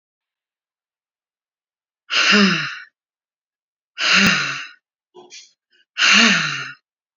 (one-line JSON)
{"exhalation_length": "7.2 s", "exhalation_amplitude": 29924, "exhalation_signal_mean_std_ratio": 0.41, "survey_phase": "beta (2021-08-13 to 2022-03-07)", "age": "45-64", "gender": "Female", "wearing_mask": "No", "symptom_none": true, "smoker_status": "Current smoker (11 or more cigarettes per day)", "respiratory_condition_asthma": true, "respiratory_condition_other": true, "recruitment_source": "REACT", "submission_delay": "12 days", "covid_test_result": "Negative", "covid_test_method": "RT-qPCR"}